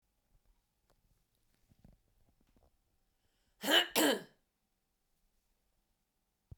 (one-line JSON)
{"cough_length": "6.6 s", "cough_amplitude": 6668, "cough_signal_mean_std_ratio": 0.21, "survey_phase": "beta (2021-08-13 to 2022-03-07)", "age": "18-44", "gender": "Female", "wearing_mask": "No", "symptom_none": true, "smoker_status": "Never smoked", "respiratory_condition_asthma": false, "respiratory_condition_other": false, "recruitment_source": "REACT", "submission_delay": "1 day", "covid_test_result": "Negative", "covid_test_method": "RT-qPCR"}